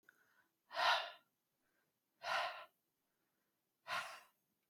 exhalation_length: 4.7 s
exhalation_amplitude: 2957
exhalation_signal_mean_std_ratio: 0.34
survey_phase: beta (2021-08-13 to 2022-03-07)
age: 45-64
gender: Male
wearing_mask: 'No'
symptom_none: true
smoker_status: Never smoked
respiratory_condition_asthma: false
respiratory_condition_other: false
recruitment_source: REACT
submission_delay: 1 day
covid_test_result: Negative
covid_test_method: RT-qPCR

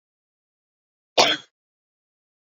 cough_length: 2.6 s
cough_amplitude: 25836
cough_signal_mean_std_ratio: 0.2
survey_phase: beta (2021-08-13 to 2022-03-07)
age: 45-64
gender: Female
wearing_mask: 'No'
symptom_cough_any: true
symptom_onset: 12 days
smoker_status: Never smoked
respiratory_condition_asthma: false
respiratory_condition_other: false
recruitment_source: REACT
submission_delay: 2 days
covid_test_result: Negative
covid_test_method: RT-qPCR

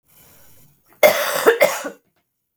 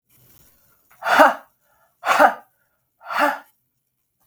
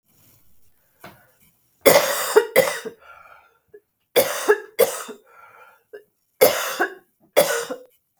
cough_length: 2.6 s
cough_amplitude: 32768
cough_signal_mean_std_ratio: 0.39
exhalation_length: 4.3 s
exhalation_amplitude: 32768
exhalation_signal_mean_std_ratio: 0.33
three_cough_length: 8.2 s
three_cough_amplitude: 32768
three_cough_signal_mean_std_ratio: 0.37
survey_phase: beta (2021-08-13 to 2022-03-07)
age: 45-64
gender: Female
wearing_mask: 'No'
symptom_runny_or_blocked_nose: true
symptom_change_to_sense_of_smell_or_taste: true
symptom_loss_of_taste: true
symptom_onset: 6 days
smoker_status: Never smoked
respiratory_condition_asthma: false
respiratory_condition_other: false
recruitment_source: Test and Trace
submission_delay: 2 days
covid_test_result: Positive
covid_test_method: ePCR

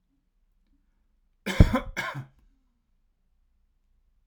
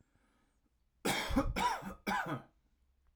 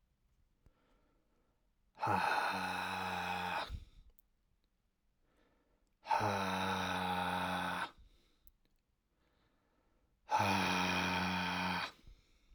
cough_length: 4.3 s
cough_amplitude: 30300
cough_signal_mean_std_ratio: 0.19
three_cough_length: 3.2 s
three_cough_amplitude: 3527
three_cough_signal_mean_std_ratio: 0.51
exhalation_length: 12.5 s
exhalation_amplitude: 2871
exhalation_signal_mean_std_ratio: 0.58
survey_phase: alpha (2021-03-01 to 2021-08-12)
age: 18-44
gender: Male
wearing_mask: 'No'
symptom_fatigue: true
symptom_headache: true
symptom_onset: 12 days
smoker_status: Ex-smoker
respiratory_condition_asthma: false
respiratory_condition_other: false
recruitment_source: REACT
submission_delay: 1 day
covid_test_result: Negative
covid_test_method: RT-qPCR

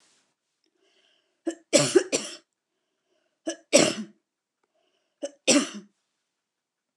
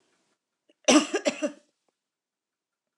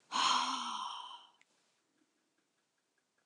three_cough_length: 7.0 s
three_cough_amplitude: 22709
three_cough_signal_mean_std_ratio: 0.27
cough_length: 3.0 s
cough_amplitude: 15693
cough_signal_mean_std_ratio: 0.27
exhalation_length: 3.3 s
exhalation_amplitude: 4095
exhalation_signal_mean_std_ratio: 0.42
survey_phase: beta (2021-08-13 to 2022-03-07)
age: 65+
gender: Female
wearing_mask: 'No'
symptom_none: true
smoker_status: Never smoked
respiratory_condition_asthma: false
respiratory_condition_other: false
recruitment_source: Test and Trace
submission_delay: 2 days
covid_test_result: Negative
covid_test_method: LFT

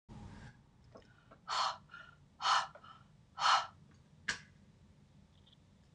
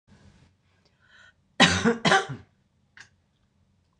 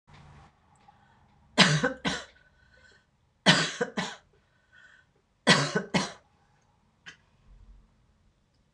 exhalation_length: 5.9 s
exhalation_amplitude: 4944
exhalation_signal_mean_std_ratio: 0.35
cough_length: 4.0 s
cough_amplitude: 19953
cough_signal_mean_std_ratio: 0.29
three_cough_length: 8.7 s
three_cough_amplitude: 21538
three_cough_signal_mean_std_ratio: 0.3
survey_phase: beta (2021-08-13 to 2022-03-07)
age: 65+
gender: Female
wearing_mask: 'No'
symptom_change_to_sense_of_smell_or_taste: true
symptom_onset: 7 days
smoker_status: Never smoked
respiratory_condition_asthma: false
respiratory_condition_other: false
recruitment_source: REACT
submission_delay: 0 days
covid_test_result: Positive
covid_test_method: RT-qPCR
covid_ct_value: 21.0
covid_ct_gene: E gene
influenza_a_test_result: Negative
influenza_b_test_result: Negative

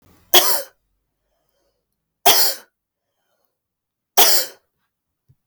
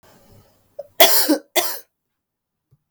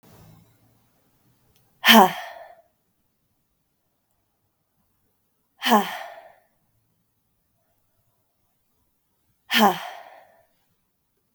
three_cough_length: 5.5 s
three_cough_amplitude: 32768
three_cough_signal_mean_std_ratio: 0.3
cough_length: 2.9 s
cough_amplitude: 32768
cough_signal_mean_std_ratio: 0.33
exhalation_length: 11.3 s
exhalation_amplitude: 32768
exhalation_signal_mean_std_ratio: 0.21
survey_phase: beta (2021-08-13 to 2022-03-07)
age: 45-64
gender: Female
wearing_mask: 'No'
symptom_cough_any: true
symptom_runny_or_blocked_nose: true
symptom_diarrhoea: true
symptom_fatigue: true
symptom_headache: true
symptom_change_to_sense_of_smell_or_taste: true
symptom_loss_of_taste: true
symptom_other: true
symptom_onset: 4 days
smoker_status: Never smoked
respiratory_condition_asthma: false
respiratory_condition_other: false
recruitment_source: Test and Trace
submission_delay: 1 day
covid_test_result: Positive
covid_test_method: RT-qPCR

